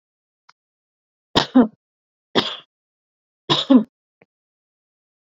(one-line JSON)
{"three_cough_length": "5.4 s", "three_cough_amplitude": 32768, "three_cough_signal_mean_std_ratio": 0.24, "survey_phase": "beta (2021-08-13 to 2022-03-07)", "age": "18-44", "gender": "Female", "wearing_mask": "No", "symptom_cough_any": true, "symptom_fatigue": true, "symptom_headache": true, "symptom_onset": "12 days", "smoker_status": "Never smoked", "respiratory_condition_asthma": false, "respiratory_condition_other": false, "recruitment_source": "REACT", "submission_delay": "-1 day", "covid_test_result": "Negative", "covid_test_method": "RT-qPCR"}